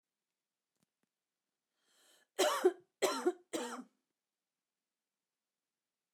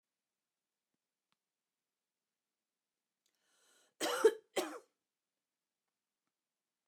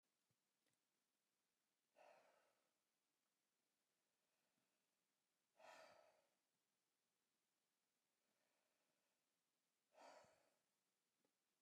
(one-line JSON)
{"three_cough_length": "6.1 s", "three_cough_amplitude": 4248, "three_cough_signal_mean_std_ratio": 0.27, "cough_length": "6.9 s", "cough_amplitude": 4850, "cough_signal_mean_std_ratio": 0.17, "exhalation_length": "11.6 s", "exhalation_amplitude": 69, "exhalation_signal_mean_std_ratio": 0.37, "survey_phase": "alpha (2021-03-01 to 2021-08-12)", "age": "65+", "gender": "Female", "wearing_mask": "No", "symptom_none": true, "smoker_status": "Never smoked", "respiratory_condition_asthma": false, "respiratory_condition_other": false, "recruitment_source": "REACT", "submission_delay": "3 days", "covid_test_result": "Negative", "covid_test_method": "RT-qPCR"}